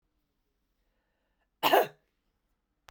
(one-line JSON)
{"cough_length": "2.9 s", "cough_amplitude": 11348, "cough_signal_mean_std_ratio": 0.21, "survey_phase": "beta (2021-08-13 to 2022-03-07)", "age": "45-64", "gender": "Female", "wearing_mask": "No", "symptom_cough_any": true, "symptom_runny_or_blocked_nose": true, "symptom_headache": true, "symptom_change_to_sense_of_smell_or_taste": true, "symptom_loss_of_taste": true, "symptom_onset": "3 days", "smoker_status": "Ex-smoker", "respiratory_condition_asthma": false, "respiratory_condition_other": false, "recruitment_source": "Test and Trace", "submission_delay": "2 days", "covid_test_result": "Positive", "covid_test_method": "RT-qPCR", "covid_ct_value": 24.8, "covid_ct_gene": "ORF1ab gene"}